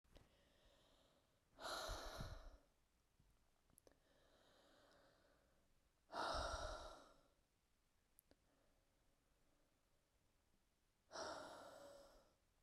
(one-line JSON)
{"exhalation_length": "12.6 s", "exhalation_amplitude": 685, "exhalation_signal_mean_std_ratio": 0.41, "survey_phase": "beta (2021-08-13 to 2022-03-07)", "age": "18-44", "gender": "Female", "wearing_mask": "No", "symptom_cough_any": true, "symptom_shortness_of_breath": true, "symptom_diarrhoea": true, "symptom_fatigue": true, "symptom_onset": "4 days", "smoker_status": "Never smoked", "respiratory_condition_asthma": false, "respiratory_condition_other": false, "recruitment_source": "Test and Trace", "submission_delay": "1 day", "covid_test_result": "Positive", "covid_test_method": "RT-qPCR", "covid_ct_value": 29.0, "covid_ct_gene": "N gene"}